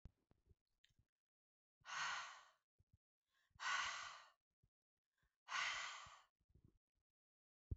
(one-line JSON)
{"exhalation_length": "7.8 s", "exhalation_amplitude": 982, "exhalation_signal_mean_std_ratio": 0.37, "survey_phase": "beta (2021-08-13 to 2022-03-07)", "age": "18-44", "gender": "Female", "wearing_mask": "No", "symptom_none": true, "smoker_status": "Never smoked", "respiratory_condition_asthma": false, "respiratory_condition_other": false, "recruitment_source": "REACT", "submission_delay": "2 days", "covid_test_result": "Negative", "covid_test_method": "RT-qPCR", "influenza_a_test_result": "Negative", "influenza_b_test_result": "Negative"}